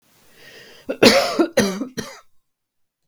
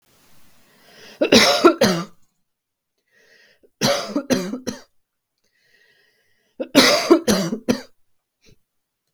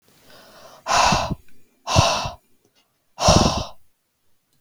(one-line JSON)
{"cough_length": "3.1 s", "cough_amplitude": 32767, "cough_signal_mean_std_ratio": 0.38, "three_cough_length": "9.1 s", "three_cough_amplitude": 32768, "three_cough_signal_mean_std_ratio": 0.37, "exhalation_length": "4.6 s", "exhalation_amplitude": 29935, "exhalation_signal_mean_std_ratio": 0.43, "survey_phase": "beta (2021-08-13 to 2022-03-07)", "age": "18-44", "gender": "Female", "wearing_mask": "No", "symptom_cough_any": true, "smoker_status": "Ex-smoker", "respiratory_condition_asthma": false, "respiratory_condition_other": false, "recruitment_source": "REACT", "submission_delay": "0 days", "covid_test_result": "Negative", "covid_test_method": "RT-qPCR"}